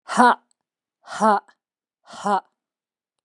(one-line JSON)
{"exhalation_length": "3.2 s", "exhalation_amplitude": 31199, "exhalation_signal_mean_std_ratio": 0.32, "survey_phase": "beta (2021-08-13 to 2022-03-07)", "age": "18-44", "gender": "Female", "wearing_mask": "No", "symptom_cough_any": true, "symptom_abdominal_pain": true, "symptom_onset": "12 days", "smoker_status": "Ex-smoker", "respiratory_condition_asthma": false, "respiratory_condition_other": false, "recruitment_source": "REACT", "submission_delay": "3 days", "covid_test_result": "Negative", "covid_test_method": "RT-qPCR", "influenza_a_test_result": "Unknown/Void", "influenza_b_test_result": "Unknown/Void"}